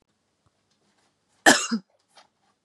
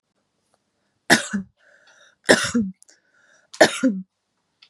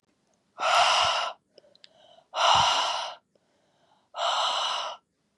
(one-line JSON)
{"cough_length": "2.6 s", "cough_amplitude": 30069, "cough_signal_mean_std_ratio": 0.21, "three_cough_length": "4.7 s", "three_cough_amplitude": 32768, "three_cough_signal_mean_std_ratio": 0.31, "exhalation_length": "5.4 s", "exhalation_amplitude": 12742, "exhalation_signal_mean_std_ratio": 0.54, "survey_phase": "beta (2021-08-13 to 2022-03-07)", "age": "18-44", "gender": "Female", "wearing_mask": "No", "symptom_cough_any": true, "symptom_runny_or_blocked_nose": true, "symptom_sore_throat": true, "symptom_fatigue": true, "symptom_fever_high_temperature": true, "symptom_headache": true, "symptom_onset": "3 days", "smoker_status": "Never smoked", "respiratory_condition_asthma": false, "respiratory_condition_other": false, "recruitment_source": "Test and Trace", "submission_delay": "1 day", "covid_test_result": "Positive", "covid_test_method": "RT-qPCR", "covid_ct_value": 16.2, "covid_ct_gene": "ORF1ab gene", "covid_ct_mean": 16.3, "covid_viral_load": "4600000 copies/ml", "covid_viral_load_category": "High viral load (>1M copies/ml)"}